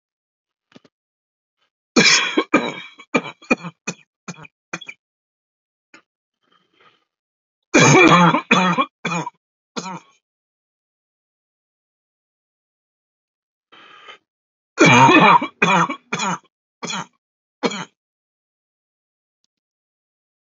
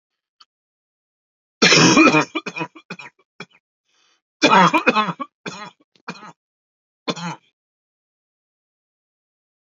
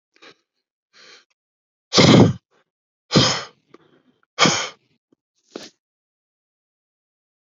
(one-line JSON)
{"three_cough_length": "20.5 s", "three_cough_amplitude": 32768, "three_cough_signal_mean_std_ratio": 0.31, "cough_length": "9.6 s", "cough_amplitude": 31429, "cough_signal_mean_std_ratio": 0.31, "exhalation_length": "7.6 s", "exhalation_amplitude": 32768, "exhalation_signal_mean_std_ratio": 0.27, "survey_phase": "alpha (2021-03-01 to 2021-08-12)", "age": "18-44", "gender": "Male", "wearing_mask": "No", "symptom_fatigue": true, "symptom_headache": true, "smoker_status": "Never smoked", "respiratory_condition_asthma": false, "respiratory_condition_other": false, "recruitment_source": "Test and Trace", "submission_delay": "2 days", "covid_test_result": "Positive", "covid_test_method": "RT-qPCR", "covid_ct_value": 22.5, "covid_ct_gene": "ORF1ab gene"}